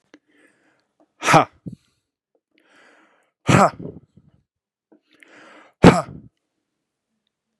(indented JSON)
{
  "exhalation_length": "7.6 s",
  "exhalation_amplitude": 32768,
  "exhalation_signal_mean_std_ratio": 0.21,
  "survey_phase": "beta (2021-08-13 to 2022-03-07)",
  "age": "45-64",
  "gender": "Male",
  "wearing_mask": "No",
  "symptom_none": true,
  "smoker_status": "Never smoked",
  "respiratory_condition_asthma": true,
  "respiratory_condition_other": false,
  "recruitment_source": "REACT",
  "submission_delay": "1 day",
  "covid_test_result": "Negative",
  "covid_test_method": "RT-qPCR",
  "influenza_a_test_result": "Negative",
  "influenza_b_test_result": "Negative"
}